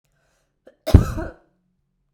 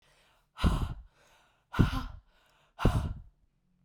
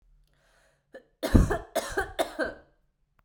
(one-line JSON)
{"cough_length": "2.1 s", "cough_amplitude": 32768, "cough_signal_mean_std_ratio": 0.22, "exhalation_length": "3.8 s", "exhalation_amplitude": 12892, "exhalation_signal_mean_std_ratio": 0.38, "three_cough_length": "3.2 s", "three_cough_amplitude": 19411, "three_cough_signal_mean_std_ratio": 0.33, "survey_phase": "beta (2021-08-13 to 2022-03-07)", "age": "18-44", "gender": "Female", "wearing_mask": "No", "symptom_cough_any": true, "symptom_runny_or_blocked_nose": true, "symptom_sore_throat": true, "symptom_fatigue": true, "symptom_headache": true, "symptom_change_to_sense_of_smell_or_taste": true, "symptom_loss_of_taste": true, "symptom_onset": "3 days", "smoker_status": "Never smoked", "respiratory_condition_asthma": false, "respiratory_condition_other": false, "recruitment_source": "Test and Trace", "submission_delay": "1 day", "covid_test_result": "Positive", "covid_test_method": "RT-qPCR", "covid_ct_value": 18.3, "covid_ct_gene": "ORF1ab gene", "covid_ct_mean": 18.3, "covid_viral_load": "1000000 copies/ml", "covid_viral_load_category": "High viral load (>1M copies/ml)"}